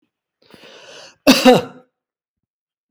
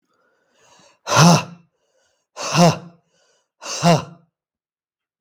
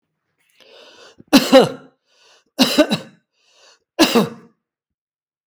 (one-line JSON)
{"cough_length": "2.9 s", "cough_amplitude": 32767, "cough_signal_mean_std_ratio": 0.28, "exhalation_length": "5.2 s", "exhalation_amplitude": 32766, "exhalation_signal_mean_std_ratio": 0.33, "three_cough_length": "5.5 s", "three_cough_amplitude": 32766, "three_cough_signal_mean_std_ratio": 0.31, "survey_phase": "beta (2021-08-13 to 2022-03-07)", "age": "65+", "gender": "Male", "wearing_mask": "No", "symptom_none": true, "smoker_status": "Never smoked", "respiratory_condition_asthma": false, "respiratory_condition_other": false, "recruitment_source": "REACT", "submission_delay": "3 days", "covid_test_result": "Negative", "covid_test_method": "RT-qPCR", "influenza_a_test_result": "Negative", "influenza_b_test_result": "Negative"}